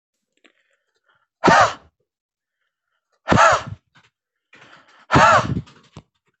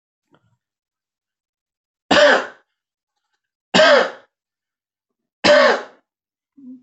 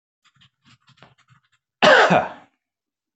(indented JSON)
{
  "exhalation_length": "6.4 s",
  "exhalation_amplitude": 26449,
  "exhalation_signal_mean_std_ratio": 0.33,
  "three_cough_length": "6.8 s",
  "three_cough_amplitude": 26482,
  "three_cough_signal_mean_std_ratio": 0.32,
  "cough_length": "3.2 s",
  "cough_amplitude": 25946,
  "cough_signal_mean_std_ratio": 0.3,
  "survey_phase": "alpha (2021-03-01 to 2021-08-12)",
  "age": "18-44",
  "gender": "Male",
  "wearing_mask": "No",
  "symptom_none": true,
  "smoker_status": "Never smoked",
  "respiratory_condition_asthma": false,
  "respiratory_condition_other": false,
  "recruitment_source": "Test and Trace",
  "submission_delay": "0 days",
  "covid_test_result": "Negative",
  "covid_test_method": "LFT"
}